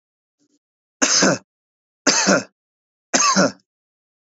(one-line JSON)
{"three_cough_length": "4.3 s", "three_cough_amplitude": 30602, "three_cough_signal_mean_std_ratio": 0.41, "survey_phase": "beta (2021-08-13 to 2022-03-07)", "age": "45-64", "gender": "Male", "wearing_mask": "No", "symptom_none": true, "smoker_status": "Current smoker (e-cigarettes or vapes only)", "respiratory_condition_asthma": false, "respiratory_condition_other": false, "recruitment_source": "REACT", "submission_delay": "2 days", "covid_test_result": "Negative", "covid_test_method": "RT-qPCR", "influenza_a_test_result": "Unknown/Void", "influenza_b_test_result": "Unknown/Void"}